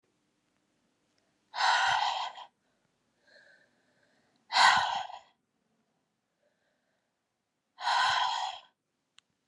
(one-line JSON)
{"exhalation_length": "9.5 s", "exhalation_amplitude": 12900, "exhalation_signal_mean_std_ratio": 0.36, "survey_phase": "alpha (2021-03-01 to 2021-08-12)", "age": "18-44", "gender": "Female", "wearing_mask": "No", "symptom_cough_any": true, "symptom_headache": true, "symptom_onset": "4 days", "smoker_status": "Never smoked", "respiratory_condition_asthma": false, "respiratory_condition_other": false, "recruitment_source": "Test and Trace", "submission_delay": "2 days", "covid_test_result": "Positive", "covid_test_method": "RT-qPCR"}